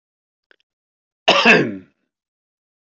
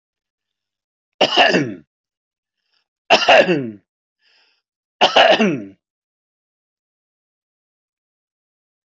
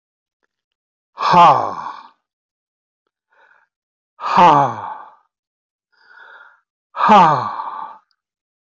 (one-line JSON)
{"cough_length": "2.8 s", "cough_amplitude": 32767, "cough_signal_mean_std_ratio": 0.31, "three_cough_length": "8.9 s", "three_cough_amplitude": 32767, "three_cough_signal_mean_std_ratio": 0.32, "exhalation_length": "8.7 s", "exhalation_amplitude": 26550, "exhalation_signal_mean_std_ratio": 0.36, "survey_phase": "beta (2021-08-13 to 2022-03-07)", "age": "65+", "gender": "Male", "wearing_mask": "No", "symptom_none": true, "smoker_status": "Never smoked", "respiratory_condition_asthma": false, "respiratory_condition_other": false, "recruitment_source": "REACT", "submission_delay": "2 days", "covid_test_result": "Negative", "covid_test_method": "RT-qPCR"}